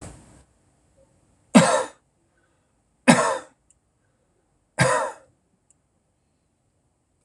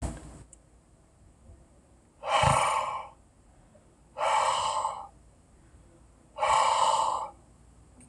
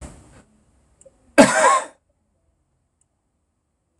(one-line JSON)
{"three_cough_length": "7.2 s", "three_cough_amplitude": 26027, "three_cough_signal_mean_std_ratio": 0.26, "exhalation_length": "8.1 s", "exhalation_amplitude": 9564, "exhalation_signal_mean_std_ratio": 0.5, "cough_length": "4.0 s", "cough_amplitude": 26028, "cough_signal_mean_std_ratio": 0.26, "survey_phase": "beta (2021-08-13 to 2022-03-07)", "age": "65+", "gender": "Male", "wearing_mask": "No", "symptom_none": true, "smoker_status": "Never smoked", "respiratory_condition_asthma": false, "respiratory_condition_other": false, "recruitment_source": "REACT", "submission_delay": "1 day", "covid_test_result": "Negative", "covid_test_method": "RT-qPCR", "influenza_a_test_result": "Negative", "influenza_b_test_result": "Negative"}